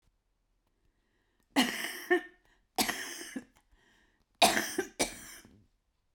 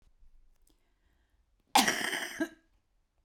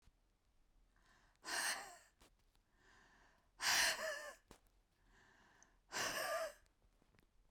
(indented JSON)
{
  "three_cough_length": "6.1 s",
  "three_cough_amplitude": 12742,
  "three_cough_signal_mean_std_ratio": 0.34,
  "cough_length": "3.2 s",
  "cough_amplitude": 10430,
  "cough_signal_mean_std_ratio": 0.31,
  "exhalation_length": "7.5 s",
  "exhalation_amplitude": 2333,
  "exhalation_signal_mean_std_ratio": 0.39,
  "survey_phase": "beta (2021-08-13 to 2022-03-07)",
  "age": "45-64",
  "gender": "Female",
  "wearing_mask": "No",
  "symptom_cough_any": true,
  "symptom_abdominal_pain": true,
  "symptom_diarrhoea": true,
  "symptom_fatigue": true,
  "symptom_onset": "12 days",
  "smoker_status": "Current smoker (11 or more cigarettes per day)",
  "respiratory_condition_asthma": true,
  "respiratory_condition_other": true,
  "recruitment_source": "REACT",
  "submission_delay": "1 day",
  "covid_test_result": "Negative",
  "covid_test_method": "RT-qPCR"
}